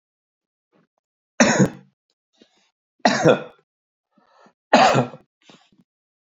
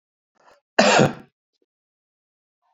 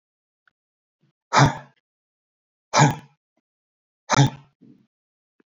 three_cough_length: 6.4 s
three_cough_amplitude: 32469
three_cough_signal_mean_std_ratio: 0.3
cough_length: 2.7 s
cough_amplitude: 27628
cough_signal_mean_std_ratio: 0.28
exhalation_length: 5.5 s
exhalation_amplitude: 24249
exhalation_signal_mean_std_ratio: 0.26
survey_phase: beta (2021-08-13 to 2022-03-07)
age: 45-64
gender: Male
wearing_mask: 'No'
symptom_none: true
smoker_status: Never smoked
respiratory_condition_asthma: false
respiratory_condition_other: false
recruitment_source: REACT
submission_delay: 2 days
covid_test_result: Negative
covid_test_method: RT-qPCR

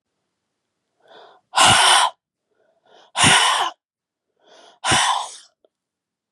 exhalation_length: 6.3 s
exhalation_amplitude: 30181
exhalation_signal_mean_std_ratio: 0.4
survey_phase: beta (2021-08-13 to 2022-03-07)
age: 18-44
gender: Female
wearing_mask: 'No'
symptom_cough_any: true
symptom_new_continuous_cough: true
symptom_runny_or_blocked_nose: true
symptom_sore_throat: true
symptom_fatigue: true
symptom_onset: 3 days
smoker_status: Never smoked
respiratory_condition_asthma: false
respiratory_condition_other: false
recruitment_source: Test and Trace
submission_delay: 1 day
covid_test_result: Positive
covid_test_method: RT-qPCR
covid_ct_value: 30.8
covid_ct_gene: N gene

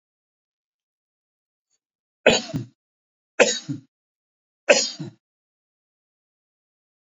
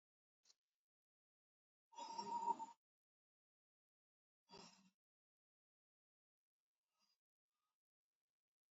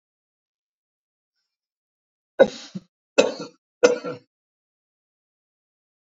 three_cough_length: 7.2 s
three_cough_amplitude: 27845
three_cough_signal_mean_std_ratio: 0.22
exhalation_length: 8.7 s
exhalation_amplitude: 990
exhalation_signal_mean_std_ratio: 0.22
cough_length: 6.1 s
cough_amplitude: 27280
cough_signal_mean_std_ratio: 0.19
survey_phase: beta (2021-08-13 to 2022-03-07)
age: 45-64
gender: Male
wearing_mask: 'No'
symptom_none: true
smoker_status: Ex-smoker
respiratory_condition_asthma: false
respiratory_condition_other: false
recruitment_source: REACT
submission_delay: 2 days
covid_test_result: Negative
covid_test_method: RT-qPCR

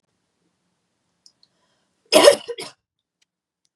cough_length: 3.8 s
cough_amplitude: 32768
cough_signal_mean_std_ratio: 0.2
survey_phase: beta (2021-08-13 to 2022-03-07)
age: 18-44
gender: Female
wearing_mask: 'No'
symptom_headache: true
smoker_status: Never smoked
respiratory_condition_asthma: false
respiratory_condition_other: false
recruitment_source: Test and Trace
submission_delay: 1 day
covid_test_result: Positive
covid_test_method: ePCR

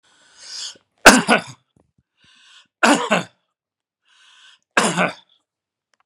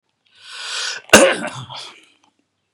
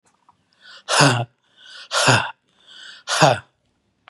three_cough_length: 6.1 s
three_cough_amplitude: 32768
three_cough_signal_mean_std_ratio: 0.28
cough_length: 2.7 s
cough_amplitude: 32768
cough_signal_mean_std_ratio: 0.33
exhalation_length: 4.1 s
exhalation_amplitude: 32046
exhalation_signal_mean_std_ratio: 0.4
survey_phase: beta (2021-08-13 to 2022-03-07)
age: 65+
gender: Male
wearing_mask: 'No'
symptom_none: true
smoker_status: Never smoked
respiratory_condition_asthma: true
respiratory_condition_other: false
recruitment_source: REACT
submission_delay: 2 days
covid_test_result: Negative
covid_test_method: RT-qPCR
influenza_a_test_result: Negative
influenza_b_test_result: Negative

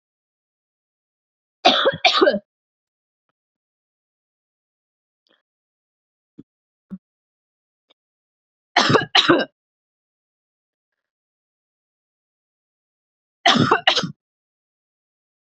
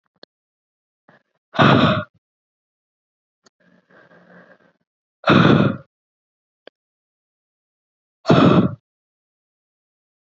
three_cough_length: 15.5 s
three_cough_amplitude: 29749
three_cough_signal_mean_std_ratio: 0.25
exhalation_length: 10.3 s
exhalation_amplitude: 28871
exhalation_signal_mean_std_ratio: 0.29
survey_phase: beta (2021-08-13 to 2022-03-07)
age: 18-44
gender: Female
wearing_mask: 'No'
symptom_abdominal_pain: true
symptom_fatigue: true
symptom_onset: 12 days
smoker_status: Current smoker (1 to 10 cigarettes per day)
respiratory_condition_asthma: false
respiratory_condition_other: false
recruitment_source: REACT
submission_delay: 1 day
covid_test_result: Negative
covid_test_method: RT-qPCR
influenza_a_test_result: Negative
influenza_b_test_result: Negative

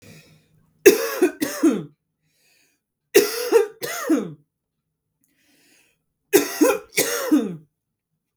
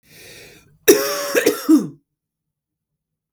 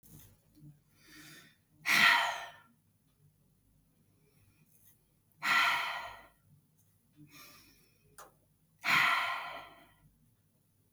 three_cough_length: 8.4 s
three_cough_amplitude: 32768
three_cough_signal_mean_std_ratio: 0.39
cough_length: 3.3 s
cough_amplitude: 32768
cough_signal_mean_std_ratio: 0.37
exhalation_length: 10.9 s
exhalation_amplitude: 8204
exhalation_signal_mean_std_ratio: 0.34
survey_phase: beta (2021-08-13 to 2022-03-07)
age: 18-44
gender: Female
wearing_mask: 'No'
symptom_fatigue: true
symptom_headache: true
symptom_onset: 3 days
smoker_status: Ex-smoker
respiratory_condition_asthma: false
respiratory_condition_other: false
recruitment_source: Test and Trace
submission_delay: 1 day
covid_test_result: Positive
covid_test_method: ePCR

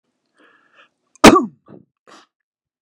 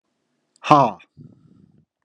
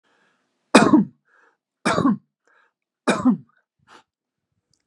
cough_length: 2.8 s
cough_amplitude: 32768
cough_signal_mean_std_ratio: 0.21
exhalation_length: 2.0 s
exhalation_amplitude: 32768
exhalation_signal_mean_std_ratio: 0.25
three_cough_length: 4.9 s
three_cough_amplitude: 32768
three_cough_signal_mean_std_ratio: 0.31
survey_phase: beta (2021-08-13 to 2022-03-07)
age: 45-64
gender: Male
wearing_mask: 'No'
symptom_none: true
smoker_status: Never smoked
respiratory_condition_asthma: false
respiratory_condition_other: false
recruitment_source: REACT
submission_delay: 2 days
covid_test_result: Negative
covid_test_method: RT-qPCR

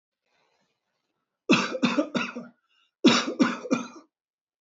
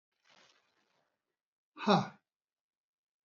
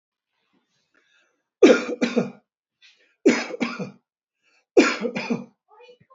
cough_length: 4.6 s
cough_amplitude: 17219
cough_signal_mean_std_ratio: 0.39
exhalation_length: 3.2 s
exhalation_amplitude: 7165
exhalation_signal_mean_std_ratio: 0.2
three_cough_length: 6.1 s
three_cough_amplitude: 27237
three_cough_signal_mean_std_ratio: 0.32
survey_phase: beta (2021-08-13 to 2022-03-07)
age: 65+
gender: Male
wearing_mask: 'No'
symptom_runny_or_blocked_nose: true
smoker_status: Ex-smoker
respiratory_condition_asthma: false
respiratory_condition_other: false
recruitment_source: REACT
submission_delay: 3 days
covid_test_result: Negative
covid_test_method: RT-qPCR
influenza_a_test_result: Negative
influenza_b_test_result: Negative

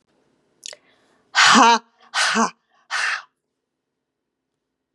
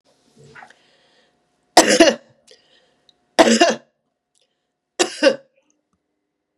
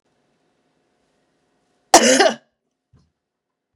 exhalation_length: 4.9 s
exhalation_amplitude: 29971
exhalation_signal_mean_std_ratio: 0.35
three_cough_length: 6.6 s
three_cough_amplitude: 32768
three_cough_signal_mean_std_ratio: 0.28
cough_length: 3.8 s
cough_amplitude: 32768
cough_signal_mean_std_ratio: 0.24
survey_phase: beta (2021-08-13 to 2022-03-07)
age: 65+
gender: Female
wearing_mask: 'No'
symptom_cough_any: true
symptom_runny_or_blocked_nose: true
symptom_sore_throat: true
symptom_onset: 3 days
smoker_status: Never smoked
respiratory_condition_asthma: false
respiratory_condition_other: false
recruitment_source: Test and Trace
submission_delay: 1 day
covid_test_result: Positive
covid_test_method: RT-qPCR
covid_ct_value: 25.8
covid_ct_gene: ORF1ab gene
covid_ct_mean: 26.3
covid_viral_load: 2300 copies/ml
covid_viral_load_category: Minimal viral load (< 10K copies/ml)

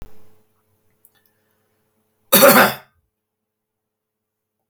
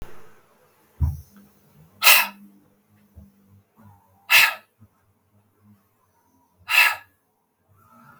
cough_length: 4.7 s
cough_amplitude: 32768
cough_signal_mean_std_ratio: 0.24
exhalation_length: 8.2 s
exhalation_amplitude: 32768
exhalation_signal_mean_std_ratio: 0.27
survey_phase: beta (2021-08-13 to 2022-03-07)
age: 45-64
gender: Male
wearing_mask: 'No'
symptom_cough_any: true
smoker_status: Never smoked
respiratory_condition_asthma: false
respiratory_condition_other: false
recruitment_source: REACT
submission_delay: 1 day
covid_test_result: Negative
covid_test_method: RT-qPCR
influenza_a_test_result: Negative
influenza_b_test_result: Negative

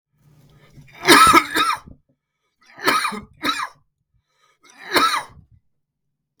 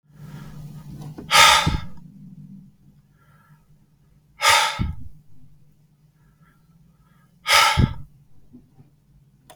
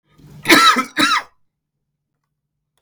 three_cough_length: 6.4 s
three_cough_amplitude: 32768
three_cough_signal_mean_std_ratio: 0.36
exhalation_length: 9.6 s
exhalation_amplitude: 32768
exhalation_signal_mean_std_ratio: 0.35
cough_length: 2.8 s
cough_amplitude: 32768
cough_signal_mean_std_ratio: 0.38
survey_phase: beta (2021-08-13 to 2022-03-07)
age: 45-64
gender: Male
wearing_mask: 'No'
symptom_cough_any: true
symptom_new_continuous_cough: true
symptom_sore_throat: true
symptom_onset: 12 days
smoker_status: Never smoked
respiratory_condition_asthma: false
respiratory_condition_other: false
recruitment_source: REACT
submission_delay: 1 day
covid_test_result: Positive
covid_test_method: RT-qPCR
covid_ct_value: 18.0
covid_ct_gene: E gene
influenza_a_test_result: Negative
influenza_b_test_result: Negative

